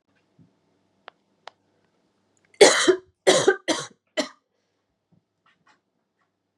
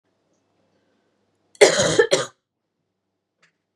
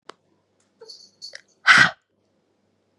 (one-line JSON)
{"three_cough_length": "6.6 s", "three_cough_amplitude": 31138, "three_cough_signal_mean_std_ratio": 0.25, "cough_length": "3.8 s", "cough_amplitude": 32768, "cough_signal_mean_std_ratio": 0.27, "exhalation_length": "3.0 s", "exhalation_amplitude": 30413, "exhalation_signal_mean_std_ratio": 0.23, "survey_phase": "beta (2021-08-13 to 2022-03-07)", "age": "18-44", "gender": "Female", "wearing_mask": "No", "symptom_cough_any": true, "symptom_runny_or_blocked_nose": true, "symptom_shortness_of_breath": true, "symptom_sore_throat": true, "symptom_fatigue": true, "symptom_headache": true, "symptom_change_to_sense_of_smell_or_taste": true, "symptom_loss_of_taste": true, "symptom_onset": "3 days", "smoker_status": "Never smoked", "respiratory_condition_asthma": false, "respiratory_condition_other": false, "recruitment_source": "Test and Trace", "submission_delay": "1 day", "covid_test_result": "Positive", "covid_test_method": "RT-qPCR", "covid_ct_value": 18.0, "covid_ct_gene": "ORF1ab gene", "covid_ct_mean": 18.5, "covid_viral_load": "860000 copies/ml", "covid_viral_load_category": "Low viral load (10K-1M copies/ml)"}